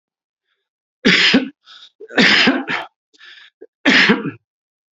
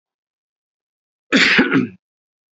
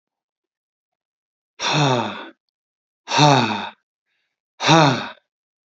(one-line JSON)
{"three_cough_length": "4.9 s", "three_cough_amplitude": 30378, "three_cough_signal_mean_std_ratio": 0.45, "cough_length": "2.6 s", "cough_amplitude": 28740, "cough_signal_mean_std_ratio": 0.37, "exhalation_length": "5.7 s", "exhalation_amplitude": 29019, "exhalation_signal_mean_std_ratio": 0.39, "survey_phase": "beta (2021-08-13 to 2022-03-07)", "age": "18-44", "gender": "Male", "wearing_mask": "No", "symptom_change_to_sense_of_smell_or_taste": true, "symptom_onset": "3 days", "smoker_status": "Never smoked", "respiratory_condition_asthma": false, "respiratory_condition_other": false, "recruitment_source": "Test and Trace", "submission_delay": "1 day", "covid_test_result": "Negative", "covid_test_method": "RT-qPCR"}